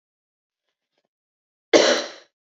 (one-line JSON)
{"cough_length": "2.6 s", "cough_amplitude": 27185, "cough_signal_mean_std_ratio": 0.26, "survey_phase": "beta (2021-08-13 to 2022-03-07)", "age": "18-44", "gender": "Female", "wearing_mask": "No", "symptom_cough_any": true, "symptom_new_continuous_cough": true, "symptom_runny_or_blocked_nose": true, "symptom_shortness_of_breath": true, "symptom_sore_throat": true, "symptom_abdominal_pain": true, "symptom_diarrhoea": true, "symptom_fatigue": true, "symptom_fever_high_temperature": true, "symptom_headache": true, "symptom_onset": "4 days", "smoker_status": "Never smoked", "respiratory_condition_asthma": false, "respiratory_condition_other": false, "recruitment_source": "Test and Trace", "submission_delay": "1 day", "covid_test_result": "Positive", "covid_test_method": "RT-qPCR", "covid_ct_value": 34.1, "covid_ct_gene": "ORF1ab gene", "covid_ct_mean": 34.8, "covid_viral_load": "3.7 copies/ml", "covid_viral_load_category": "Minimal viral load (< 10K copies/ml)"}